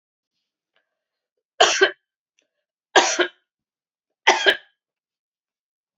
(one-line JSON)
{"three_cough_length": "6.0 s", "three_cough_amplitude": 30510, "three_cough_signal_mean_std_ratio": 0.26, "survey_phase": "beta (2021-08-13 to 2022-03-07)", "age": "65+", "gender": "Female", "wearing_mask": "No", "symptom_runny_or_blocked_nose": true, "symptom_change_to_sense_of_smell_or_taste": true, "symptom_onset": "2 days", "smoker_status": "Never smoked", "respiratory_condition_asthma": false, "respiratory_condition_other": false, "recruitment_source": "Test and Trace", "submission_delay": "1 day", "covid_test_result": "Positive", "covid_test_method": "RT-qPCR", "covid_ct_value": 18.9, "covid_ct_gene": "N gene"}